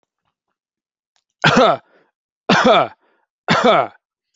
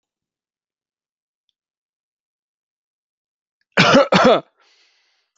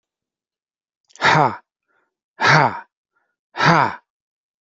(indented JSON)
{
  "three_cough_length": "4.4 s",
  "three_cough_amplitude": 32768,
  "three_cough_signal_mean_std_ratio": 0.4,
  "cough_length": "5.4 s",
  "cough_amplitude": 29073,
  "cough_signal_mean_std_ratio": 0.26,
  "exhalation_length": "4.6 s",
  "exhalation_amplitude": 27852,
  "exhalation_signal_mean_std_ratio": 0.36,
  "survey_phase": "alpha (2021-03-01 to 2021-08-12)",
  "age": "18-44",
  "gender": "Male",
  "wearing_mask": "No",
  "symptom_none": true,
  "symptom_onset": "5 days",
  "smoker_status": "Never smoked",
  "respiratory_condition_asthma": false,
  "respiratory_condition_other": false,
  "recruitment_source": "REACT",
  "submission_delay": "1 day",
  "covid_test_result": "Negative",
  "covid_test_method": "RT-qPCR"
}